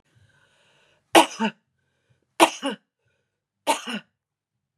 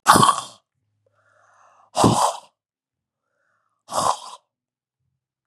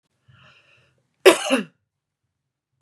{"three_cough_length": "4.8 s", "three_cough_amplitude": 32070, "three_cough_signal_mean_std_ratio": 0.23, "exhalation_length": "5.5 s", "exhalation_amplitude": 32768, "exhalation_signal_mean_std_ratio": 0.31, "cough_length": "2.8 s", "cough_amplitude": 32767, "cough_signal_mean_std_ratio": 0.22, "survey_phase": "beta (2021-08-13 to 2022-03-07)", "age": "65+", "gender": "Female", "wearing_mask": "No", "symptom_runny_or_blocked_nose": true, "symptom_shortness_of_breath": true, "symptom_sore_throat": true, "symptom_fatigue": true, "symptom_headache": true, "symptom_onset": "1 day", "smoker_status": "Never smoked", "respiratory_condition_asthma": true, "respiratory_condition_other": false, "recruitment_source": "Test and Trace", "submission_delay": "1 day", "covid_test_result": "Positive", "covid_test_method": "RT-qPCR", "covid_ct_value": 31.8, "covid_ct_gene": "ORF1ab gene", "covid_ct_mean": 32.6, "covid_viral_load": "21 copies/ml", "covid_viral_load_category": "Minimal viral load (< 10K copies/ml)"}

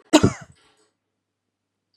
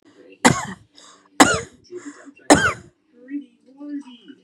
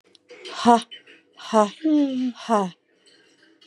{"cough_length": "2.0 s", "cough_amplitude": 32089, "cough_signal_mean_std_ratio": 0.21, "three_cough_length": "4.4 s", "three_cough_amplitude": 32768, "three_cough_signal_mean_std_ratio": 0.31, "exhalation_length": "3.7 s", "exhalation_amplitude": 28167, "exhalation_signal_mean_std_ratio": 0.44, "survey_phase": "beta (2021-08-13 to 2022-03-07)", "age": "18-44", "gender": "Female", "wearing_mask": "No", "symptom_none": true, "smoker_status": "Ex-smoker", "respiratory_condition_asthma": false, "respiratory_condition_other": false, "recruitment_source": "REACT", "submission_delay": "1 day", "covid_test_result": "Negative", "covid_test_method": "RT-qPCR", "influenza_a_test_result": "Negative", "influenza_b_test_result": "Negative"}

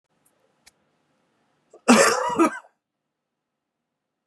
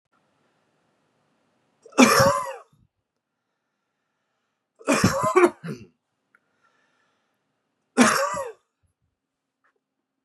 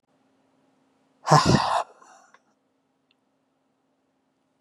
{"cough_length": "4.3 s", "cough_amplitude": 31487, "cough_signal_mean_std_ratio": 0.28, "three_cough_length": "10.2 s", "three_cough_amplitude": 27624, "three_cough_signal_mean_std_ratio": 0.29, "exhalation_length": "4.6 s", "exhalation_amplitude": 27926, "exhalation_signal_mean_std_ratio": 0.26, "survey_phase": "beta (2021-08-13 to 2022-03-07)", "age": "18-44", "gender": "Male", "wearing_mask": "No", "symptom_cough_any": true, "symptom_runny_or_blocked_nose": true, "symptom_sore_throat": true, "symptom_diarrhoea": true, "symptom_fatigue": true, "symptom_fever_high_temperature": true, "symptom_onset": "4 days", "smoker_status": "Never smoked", "respiratory_condition_asthma": false, "respiratory_condition_other": false, "recruitment_source": "Test and Trace", "submission_delay": "1 day", "covid_test_result": "Positive", "covid_test_method": "ePCR"}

